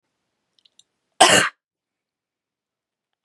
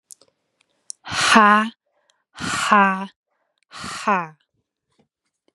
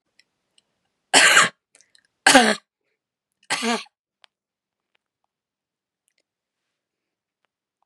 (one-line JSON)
{"cough_length": "3.2 s", "cough_amplitude": 32768, "cough_signal_mean_std_ratio": 0.22, "exhalation_length": "5.5 s", "exhalation_amplitude": 32767, "exhalation_signal_mean_std_ratio": 0.36, "three_cough_length": "7.9 s", "three_cough_amplitude": 32768, "three_cough_signal_mean_std_ratio": 0.24, "survey_phase": "beta (2021-08-13 to 2022-03-07)", "age": "18-44", "gender": "Female", "wearing_mask": "No", "symptom_cough_any": true, "symptom_runny_or_blocked_nose": true, "symptom_sore_throat": true, "symptom_diarrhoea": true, "symptom_other": true, "smoker_status": "Ex-smoker", "respiratory_condition_asthma": false, "respiratory_condition_other": false, "recruitment_source": "Test and Trace", "submission_delay": "2 days", "covid_test_result": "Positive", "covid_test_method": "ePCR"}